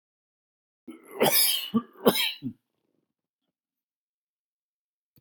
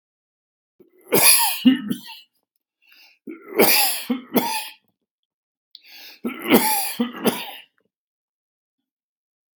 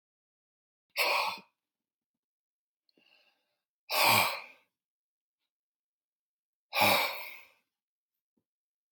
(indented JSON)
{
  "cough_length": "5.2 s",
  "cough_amplitude": 19798,
  "cough_signal_mean_std_ratio": 0.32,
  "three_cough_length": "9.6 s",
  "three_cough_amplitude": 32768,
  "three_cough_signal_mean_std_ratio": 0.39,
  "exhalation_length": "8.9 s",
  "exhalation_amplitude": 9678,
  "exhalation_signal_mean_std_ratio": 0.3,
  "survey_phase": "beta (2021-08-13 to 2022-03-07)",
  "age": "65+",
  "gender": "Male",
  "wearing_mask": "No",
  "symptom_cough_any": true,
  "symptom_runny_or_blocked_nose": true,
  "smoker_status": "Ex-smoker",
  "respiratory_condition_asthma": false,
  "respiratory_condition_other": false,
  "recruitment_source": "REACT",
  "submission_delay": "2 days",
  "covid_test_result": "Negative",
  "covid_test_method": "RT-qPCR",
  "influenza_a_test_result": "Negative",
  "influenza_b_test_result": "Negative"
}